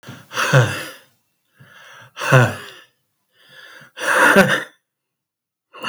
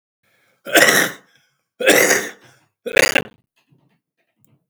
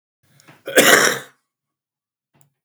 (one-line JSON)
{"exhalation_length": "5.9 s", "exhalation_amplitude": 29639, "exhalation_signal_mean_std_ratio": 0.4, "three_cough_length": "4.7 s", "three_cough_amplitude": 32767, "three_cough_signal_mean_std_ratio": 0.37, "cough_length": "2.6 s", "cough_amplitude": 32768, "cough_signal_mean_std_ratio": 0.32, "survey_phase": "beta (2021-08-13 to 2022-03-07)", "age": "45-64", "gender": "Male", "wearing_mask": "No", "symptom_cough_any": true, "symptom_runny_or_blocked_nose": true, "symptom_shortness_of_breath": true, "symptom_headache": true, "smoker_status": "Never smoked", "respiratory_condition_asthma": true, "respiratory_condition_other": true, "recruitment_source": "Test and Trace", "submission_delay": "2 days", "covid_test_result": "Positive", "covid_test_method": "RT-qPCR"}